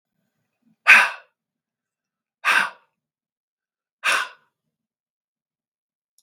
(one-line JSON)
{"exhalation_length": "6.2 s", "exhalation_amplitude": 32768, "exhalation_signal_mean_std_ratio": 0.23, "survey_phase": "beta (2021-08-13 to 2022-03-07)", "age": "45-64", "gender": "Male", "wearing_mask": "No", "symptom_cough_any": true, "smoker_status": "Ex-smoker", "respiratory_condition_asthma": false, "respiratory_condition_other": false, "recruitment_source": "REACT", "submission_delay": "0 days", "covid_test_result": "Negative", "covid_test_method": "RT-qPCR"}